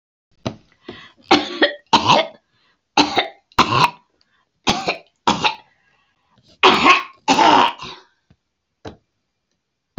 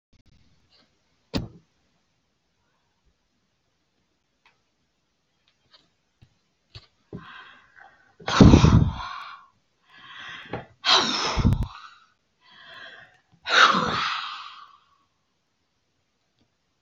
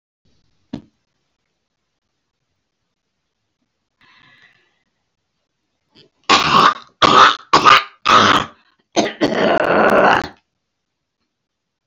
{
  "three_cough_length": "10.0 s",
  "three_cough_amplitude": 32767,
  "three_cough_signal_mean_std_ratio": 0.39,
  "exhalation_length": "16.8 s",
  "exhalation_amplitude": 27743,
  "exhalation_signal_mean_std_ratio": 0.27,
  "cough_length": "11.9 s",
  "cough_amplitude": 30908,
  "cough_signal_mean_std_ratio": 0.37,
  "survey_phase": "beta (2021-08-13 to 2022-03-07)",
  "age": "65+",
  "gender": "Female",
  "wearing_mask": "No",
  "symptom_none": true,
  "smoker_status": "Ex-smoker",
  "respiratory_condition_asthma": false,
  "respiratory_condition_other": false,
  "recruitment_source": "REACT",
  "submission_delay": "4 days",
  "covid_test_result": "Negative",
  "covid_test_method": "RT-qPCR",
  "influenza_a_test_result": "Negative",
  "influenza_b_test_result": "Negative"
}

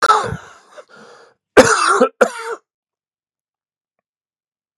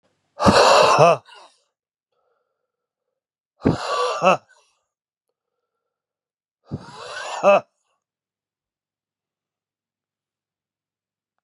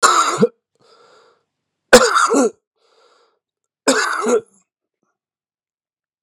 {
  "cough_length": "4.8 s",
  "cough_amplitude": 32768,
  "cough_signal_mean_std_ratio": 0.34,
  "exhalation_length": "11.4 s",
  "exhalation_amplitude": 32767,
  "exhalation_signal_mean_std_ratio": 0.3,
  "three_cough_length": "6.2 s",
  "three_cough_amplitude": 32768,
  "three_cough_signal_mean_std_ratio": 0.37,
  "survey_phase": "beta (2021-08-13 to 2022-03-07)",
  "age": "45-64",
  "gender": "Male",
  "wearing_mask": "No",
  "symptom_cough_any": true,
  "symptom_runny_or_blocked_nose": true,
  "symptom_sore_throat": true,
  "symptom_fatigue": true,
  "symptom_headache": true,
  "symptom_change_to_sense_of_smell_or_taste": true,
  "symptom_loss_of_taste": true,
  "symptom_onset": "5 days",
  "smoker_status": "Ex-smoker",
  "respiratory_condition_asthma": false,
  "respiratory_condition_other": false,
  "recruitment_source": "Test and Trace",
  "submission_delay": "1 day",
  "covid_test_result": "Positive",
  "covid_test_method": "RT-qPCR",
  "covid_ct_value": 18.6,
  "covid_ct_gene": "N gene"
}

